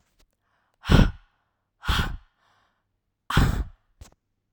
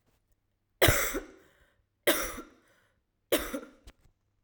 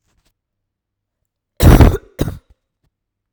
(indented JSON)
{
  "exhalation_length": "4.5 s",
  "exhalation_amplitude": 23879,
  "exhalation_signal_mean_std_ratio": 0.31,
  "three_cough_length": "4.4 s",
  "three_cough_amplitude": 12502,
  "three_cough_signal_mean_std_ratio": 0.32,
  "cough_length": "3.3 s",
  "cough_amplitude": 32768,
  "cough_signal_mean_std_ratio": 0.28,
  "survey_phase": "alpha (2021-03-01 to 2021-08-12)",
  "age": "18-44",
  "gender": "Female",
  "wearing_mask": "No",
  "symptom_cough_any": true,
  "symptom_fatigue": true,
  "symptom_fever_high_temperature": true,
  "symptom_headache": true,
  "symptom_onset": "5 days",
  "smoker_status": "Never smoked",
  "respiratory_condition_asthma": false,
  "respiratory_condition_other": false,
  "recruitment_source": "Test and Trace",
  "submission_delay": "1 day",
  "covid_test_result": "Positive",
  "covid_test_method": "RT-qPCR",
  "covid_ct_value": 23.6,
  "covid_ct_gene": "N gene"
}